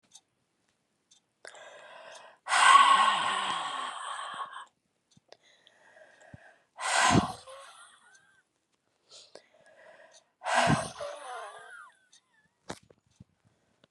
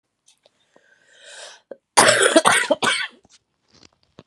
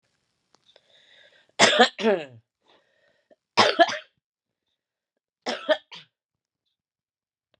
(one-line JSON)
{"exhalation_length": "13.9 s", "exhalation_amplitude": 14355, "exhalation_signal_mean_std_ratio": 0.34, "cough_length": "4.3 s", "cough_amplitude": 32767, "cough_signal_mean_std_ratio": 0.36, "three_cough_length": "7.6 s", "three_cough_amplitude": 27868, "three_cough_signal_mean_std_ratio": 0.26, "survey_phase": "beta (2021-08-13 to 2022-03-07)", "age": "45-64", "gender": "Female", "wearing_mask": "No", "symptom_cough_any": true, "symptom_new_continuous_cough": true, "symptom_runny_or_blocked_nose": true, "symptom_fatigue": true, "symptom_fever_high_temperature": true, "symptom_headache": true, "smoker_status": "Current smoker (e-cigarettes or vapes only)", "respiratory_condition_asthma": true, "respiratory_condition_other": false, "recruitment_source": "Test and Trace", "submission_delay": "2 days", "covid_test_result": "Positive", "covid_test_method": "RT-qPCR", "covid_ct_value": 20.6, "covid_ct_gene": "ORF1ab gene"}